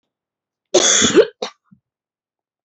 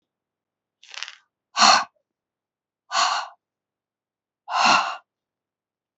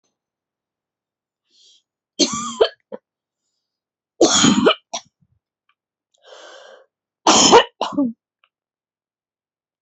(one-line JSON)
{"cough_length": "2.6 s", "cough_amplitude": 31444, "cough_signal_mean_std_ratio": 0.36, "exhalation_length": "6.0 s", "exhalation_amplitude": 28822, "exhalation_signal_mean_std_ratio": 0.31, "three_cough_length": "9.8 s", "three_cough_amplitude": 31719, "three_cough_signal_mean_std_ratio": 0.3, "survey_phase": "beta (2021-08-13 to 2022-03-07)", "age": "45-64", "gender": "Female", "wearing_mask": "No", "symptom_cough_any": true, "symptom_new_continuous_cough": true, "symptom_runny_or_blocked_nose": true, "symptom_shortness_of_breath": true, "symptom_sore_throat": true, "symptom_diarrhoea": true, "symptom_fatigue": true, "symptom_fever_high_temperature": true, "symptom_change_to_sense_of_smell_or_taste": true, "symptom_loss_of_taste": true, "symptom_onset": "5 days", "smoker_status": "Never smoked", "respiratory_condition_asthma": false, "respiratory_condition_other": false, "recruitment_source": "Test and Trace", "submission_delay": "2 days", "covid_test_result": "Positive", "covid_test_method": "RT-qPCR", "covid_ct_value": 21.4, "covid_ct_gene": "ORF1ab gene"}